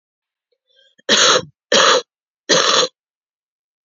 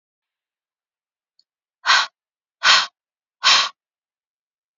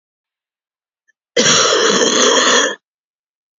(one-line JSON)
{"three_cough_length": "3.8 s", "three_cough_amplitude": 32768, "three_cough_signal_mean_std_ratio": 0.42, "exhalation_length": "4.8 s", "exhalation_amplitude": 32634, "exhalation_signal_mean_std_ratio": 0.29, "cough_length": "3.6 s", "cough_amplitude": 32767, "cough_signal_mean_std_ratio": 0.55, "survey_phase": "beta (2021-08-13 to 2022-03-07)", "age": "45-64", "gender": "Female", "wearing_mask": "No", "symptom_cough_any": true, "symptom_runny_or_blocked_nose": true, "symptom_fatigue": true, "symptom_fever_high_temperature": true, "symptom_headache": true, "symptom_change_to_sense_of_smell_or_taste": true, "symptom_loss_of_taste": true, "symptom_onset": "5 days", "smoker_status": "Current smoker (1 to 10 cigarettes per day)", "respiratory_condition_asthma": false, "respiratory_condition_other": false, "recruitment_source": "Test and Trace", "submission_delay": "1 day", "covid_test_result": "Positive", "covid_test_method": "RT-qPCR", "covid_ct_value": 19.6, "covid_ct_gene": "ORF1ab gene"}